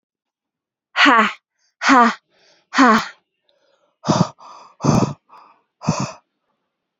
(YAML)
exhalation_length: 7.0 s
exhalation_amplitude: 31112
exhalation_signal_mean_std_ratio: 0.38
survey_phase: beta (2021-08-13 to 2022-03-07)
age: 18-44
gender: Female
wearing_mask: 'No'
symptom_cough_any: true
symptom_runny_or_blocked_nose: true
symptom_sore_throat: true
symptom_fatigue: true
symptom_headache: true
symptom_onset: 5 days
smoker_status: Ex-smoker
respiratory_condition_asthma: true
respiratory_condition_other: false
recruitment_source: Test and Trace
submission_delay: 1 day
covid_test_result: Positive
covid_test_method: RT-qPCR